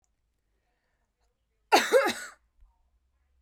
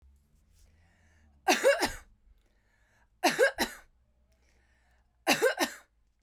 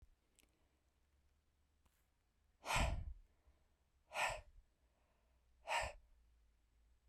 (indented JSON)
{
  "cough_length": "3.4 s",
  "cough_amplitude": 15119,
  "cough_signal_mean_std_ratio": 0.26,
  "three_cough_length": "6.2 s",
  "three_cough_amplitude": 8848,
  "three_cough_signal_mean_std_ratio": 0.33,
  "exhalation_length": "7.1 s",
  "exhalation_amplitude": 1824,
  "exhalation_signal_mean_std_ratio": 0.32,
  "survey_phase": "beta (2021-08-13 to 2022-03-07)",
  "age": "18-44",
  "gender": "Female",
  "wearing_mask": "No",
  "symptom_none": true,
  "smoker_status": "Never smoked",
  "respiratory_condition_asthma": false,
  "respiratory_condition_other": false,
  "recruitment_source": "Test and Trace",
  "submission_delay": "2 days",
  "covid_test_result": "Negative",
  "covid_test_method": "RT-qPCR"
}